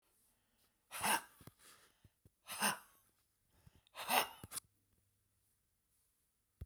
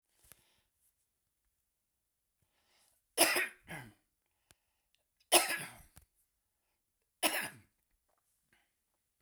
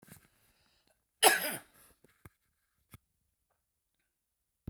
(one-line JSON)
{"exhalation_length": "6.7 s", "exhalation_amplitude": 5440, "exhalation_signal_mean_std_ratio": 0.28, "three_cough_length": "9.2 s", "three_cough_amplitude": 9601, "three_cough_signal_mean_std_ratio": 0.22, "cough_length": "4.7 s", "cough_amplitude": 13026, "cough_signal_mean_std_ratio": 0.18, "survey_phase": "beta (2021-08-13 to 2022-03-07)", "age": "65+", "gender": "Male", "wearing_mask": "No", "symptom_cough_any": true, "smoker_status": "Ex-smoker", "respiratory_condition_asthma": true, "respiratory_condition_other": false, "recruitment_source": "REACT", "submission_delay": "1 day", "covid_test_result": "Negative", "covid_test_method": "RT-qPCR"}